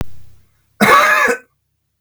cough_length: 2.0 s
cough_amplitude: 32768
cough_signal_mean_std_ratio: 0.52
survey_phase: beta (2021-08-13 to 2022-03-07)
age: 45-64
gender: Male
wearing_mask: 'No'
symptom_none: true
smoker_status: Ex-smoker
respiratory_condition_asthma: false
respiratory_condition_other: false
recruitment_source: Test and Trace
submission_delay: 2 days
covid_test_result: Negative
covid_test_method: RT-qPCR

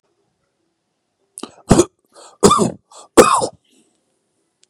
three_cough_length: 4.7 s
three_cough_amplitude: 32768
three_cough_signal_mean_std_ratio: 0.29
survey_phase: beta (2021-08-13 to 2022-03-07)
age: 45-64
gender: Male
wearing_mask: 'No'
symptom_none: true
smoker_status: Ex-smoker
respiratory_condition_asthma: false
respiratory_condition_other: false
recruitment_source: REACT
submission_delay: 2 days
covid_test_result: Negative
covid_test_method: RT-qPCR
influenza_a_test_result: Negative
influenza_b_test_result: Negative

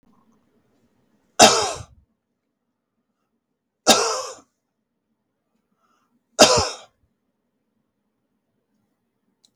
three_cough_length: 9.6 s
three_cough_amplitude: 32768
three_cough_signal_mean_std_ratio: 0.22
survey_phase: beta (2021-08-13 to 2022-03-07)
age: 65+
gender: Male
wearing_mask: 'No'
symptom_none: true
smoker_status: Never smoked
respiratory_condition_asthma: false
respiratory_condition_other: false
recruitment_source: REACT
submission_delay: 3 days
covid_test_result: Negative
covid_test_method: RT-qPCR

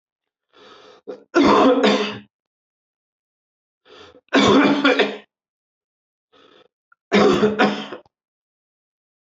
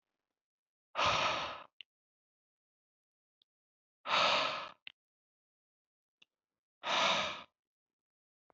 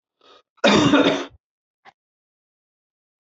three_cough_length: 9.2 s
three_cough_amplitude: 23778
three_cough_signal_mean_std_ratio: 0.41
exhalation_length: 8.5 s
exhalation_amplitude: 5132
exhalation_signal_mean_std_ratio: 0.35
cough_length: 3.2 s
cough_amplitude: 22166
cough_signal_mean_std_ratio: 0.35
survey_phase: beta (2021-08-13 to 2022-03-07)
age: 45-64
gender: Male
wearing_mask: 'No'
symptom_cough_any: true
symptom_runny_or_blocked_nose: true
symptom_sore_throat: true
symptom_abdominal_pain: true
symptom_fatigue: true
symptom_headache: true
smoker_status: Never smoked
respiratory_condition_asthma: false
respiratory_condition_other: false
recruitment_source: Test and Trace
submission_delay: 2 days
covid_test_result: Positive
covid_test_method: RT-qPCR
covid_ct_value: 19.3
covid_ct_gene: ORF1ab gene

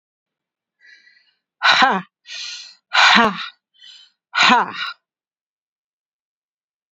exhalation_length: 6.9 s
exhalation_amplitude: 30412
exhalation_signal_mean_std_ratio: 0.35
survey_phase: beta (2021-08-13 to 2022-03-07)
age: 65+
gender: Female
wearing_mask: 'No'
symptom_none: true
smoker_status: Never smoked
respiratory_condition_asthma: true
respiratory_condition_other: false
recruitment_source: REACT
submission_delay: 1 day
covid_test_result: Negative
covid_test_method: RT-qPCR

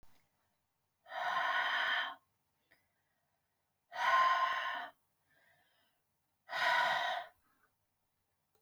exhalation_length: 8.6 s
exhalation_amplitude: 3979
exhalation_signal_mean_std_ratio: 0.47
survey_phase: alpha (2021-03-01 to 2021-08-12)
age: 45-64
gender: Female
wearing_mask: 'No'
symptom_none: true
smoker_status: Never smoked
respiratory_condition_asthma: false
respiratory_condition_other: false
recruitment_source: REACT
submission_delay: 4 days
covid_test_result: Negative
covid_test_method: RT-qPCR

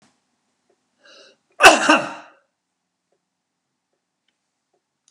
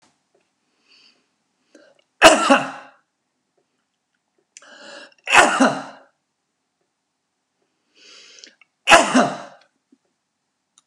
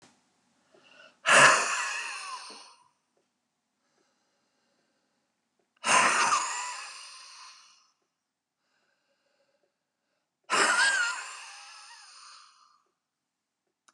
cough_length: 5.1 s
cough_amplitude: 32768
cough_signal_mean_std_ratio: 0.2
three_cough_length: 10.9 s
three_cough_amplitude: 32768
three_cough_signal_mean_std_ratio: 0.26
exhalation_length: 13.9 s
exhalation_amplitude: 17739
exhalation_signal_mean_std_ratio: 0.33
survey_phase: beta (2021-08-13 to 2022-03-07)
age: 65+
gender: Male
wearing_mask: 'No'
symptom_none: true
smoker_status: Never smoked
respiratory_condition_asthma: false
respiratory_condition_other: false
recruitment_source: REACT
submission_delay: 0 days
covid_test_result: Negative
covid_test_method: RT-qPCR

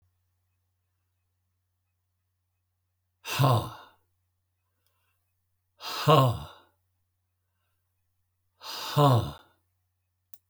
exhalation_length: 10.5 s
exhalation_amplitude: 15549
exhalation_signal_mean_std_ratio: 0.27
survey_phase: alpha (2021-03-01 to 2021-08-12)
age: 65+
gender: Male
wearing_mask: 'No'
symptom_none: true
smoker_status: Never smoked
respiratory_condition_asthma: false
respiratory_condition_other: false
recruitment_source: REACT
submission_delay: 2 days
covid_test_result: Negative
covid_test_method: RT-qPCR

